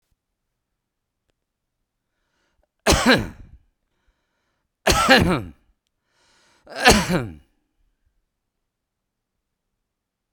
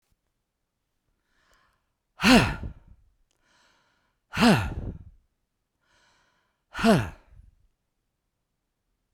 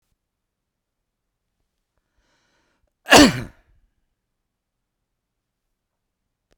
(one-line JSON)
{"three_cough_length": "10.3 s", "three_cough_amplitude": 32768, "three_cough_signal_mean_std_ratio": 0.27, "exhalation_length": "9.1 s", "exhalation_amplitude": 21848, "exhalation_signal_mean_std_ratio": 0.26, "cough_length": "6.6 s", "cough_amplitude": 32768, "cough_signal_mean_std_ratio": 0.15, "survey_phase": "beta (2021-08-13 to 2022-03-07)", "age": "65+", "gender": "Male", "wearing_mask": "No", "symptom_none": true, "smoker_status": "Current smoker (11 or more cigarettes per day)", "respiratory_condition_asthma": false, "respiratory_condition_other": false, "recruitment_source": "REACT", "submission_delay": "2 days", "covid_test_result": "Negative", "covid_test_method": "RT-qPCR", "influenza_a_test_result": "Negative", "influenza_b_test_result": "Negative"}